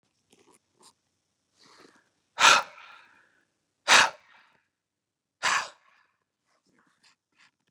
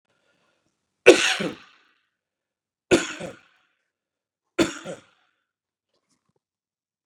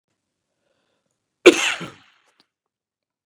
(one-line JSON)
{"exhalation_length": "7.7 s", "exhalation_amplitude": 23466, "exhalation_signal_mean_std_ratio": 0.21, "three_cough_length": "7.1 s", "three_cough_amplitude": 32768, "three_cough_signal_mean_std_ratio": 0.2, "cough_length": "3.3 s", "cough_amplitude": 32768, "cough_signal_mean_std_ratio": 0.18, "survey_phase": "beta (2021-08-13 to 2022-03-07)", "age": "45-64", "gender": "Male", "wearing_mask": "No", "symptom_none": true, "smoker_status": "Never smoked", "respiratory_condition_asthma": false, "respiratory_condition_other": false, "recruitment_source": "REACT", "submission_delay": "5 days", "covid_test_result": "Negative", "covid_test_method": "RT-qPCR", "influenza_a_test_result": "Unknown/Void", "influenza_b_test_result": "Unknown/Void"}